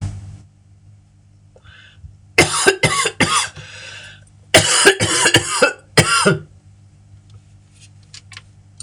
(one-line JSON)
{"cough_length": "8.8 s", "cough_amplitude": 26028, "cough_signal_mean_std_ratio": 0.44, "survey_phase": "beta (2021-08-13 to 2022-03-07)", "age": "65+", "gender": "Female", "wearing_mask": "No", "symptom_cough_any": true, "symptom_fatigue": true, "symptom_headache": true, "symptom_onset": "4 days", "smoker_status": "Never smoked", "respiratory_condition_asthma": false, "respiratory_condition_other": false, "recruitment_source": "Test and Trace", "submission_delay": "1 day", "covid_test_result": "Positive", "covid_test_method": "ePCR"}